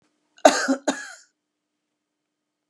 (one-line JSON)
{"cough_length": "2.7 s", "cough_amplitude": 32767, "cough_signal_mean_std_ratio": 0.25, "survey_phase": "beta (2021-08-13 to 2022-03-07)", "age": "45-64", "gender": "Female", "wearing_mask": "No", "symptom_none": true, "smoker_status": "Never smoked", "respiratory_condition_asthma": false, "respiratory_condition_other": false, "recruitment_source": "REACT", "submission_delay": "2 days", "covid_test_result": "Negative", "covid_test_method": "RT-qPCR", "influenza_a_test_result": "Negative", "influenza_b_test_result": "Negative"}